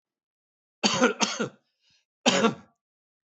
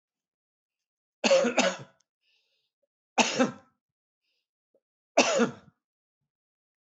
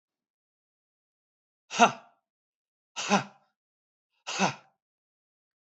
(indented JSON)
{
  "cough_length": "3.3 s",
  "cough_amplitude": 17215,
  "cough_signal_mean_std_ratio": 0.36,
  "three_cough_length": "6.8 s",
  "three_cough_amplitude": 15602,
  "three_cough_signal_mean_std_ratio": 0.31,
  "exhalation_length": "5.6 s",
  "exhalation_amplitude": 17135,
  "exhalation_signal_mean_std_ratio": 0.22,
  "survey_phase": "beta (2021-08-13 to 2022-03-07)",
  "age": "65+",
  "gender": "Male",
  "wearing_mask": "No",
  "symptom_none": true,
  "smoker_status": "Never smoked",
  "respiratory_condition_asthma": false,
  "respiratory_condition_other": false,
  "recruitment_source": "REACT",
  "submission_delay": "3 days",
  "covid_test_result": "Negative",
  "covid_test_method": "RT-qPCR",
  "influenza_a_test_result": "Negative",
  "influenza_b_test_result": "Negative"
}